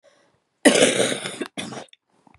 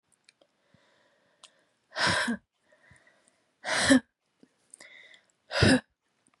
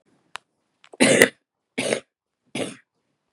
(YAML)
cough_length: 2.4 s
cough_amplitude: 32329
cough_signal_mean_std_ratio: 0.4
exhalation_length: 6.4 s
exhalation_amplitude: 15165
exhalation_signal_mean_std_ratio: 0.3
three_cough_length: 3.3 s
three_cough_amplitude: 32768
three_cough_signal_mean_std_ratio: 0.29
survey_phase: beta (2021-08-13 to 2022-03-07)
age: 18-44
gender: Female
wearing_mask: 'No'
symptom_cough_any: true
symptom_runny_or_blocked_nose: true
symptom_shortness_of_breath: true
symptom_diarrhoea: true
symptom_headache: true
symptom_onset: 4 days
smoker_status: Never smoked
respiratory_condition_asthma: false
respiratory_condition_other: false
recruitment_source: Test and Trace
submission_delay: 1 day
covid_test_result: Positive
covid_test_method: RT-qPCR
covid_ct_value: 20.2
covid_ct_gene: ORF1ab gene
covid_ct_mean: 20.6
covid_viral_load: 180000 copies/ml
covid_viral_load_category: Low viral load (10K-1M copies/ml)